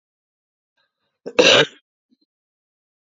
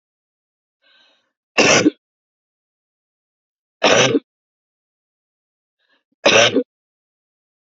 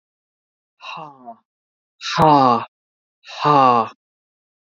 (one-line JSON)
{"cough_length": "3.1 s", "cough_amplitude": 32768, "cough_signal_mean_std_ratio": 0.24, "three_cough_length": "7.7 s", "three_cough_amplitude": 29965, "three_cough_signal_mean_std_ratio": 0.29, "exhalation_length": "4.7 s", "exhalation_amplitude": 30107, "exhalation_signal_mean_std_ratio": 0.38, "survey_phase": "beta (2021-08-13 to 2022-03-07)", "age": "45-64", "gender": "Female", "wearing_mask": "No", "symptom_cough_any": true, "symptom_runny_or_blocked_nose": true, "symptom_sore_throat": true, "symptom_fatigue": true, "symptom_headache": true, "symptom_other": true, "symptom_onset": "4 days", "smoker_status": "Ex-smoker", "respiratory_condition_asthma": true, "respiratory_condition_other": false, "recruitment_source": "Test and Trace", "submission_delay": "2 days", "covid_test_result": "Positive", "covid_test_method": "RT-qPCR", "covid_ct_value": 21.1, "covid_ct_gene": "N gene"}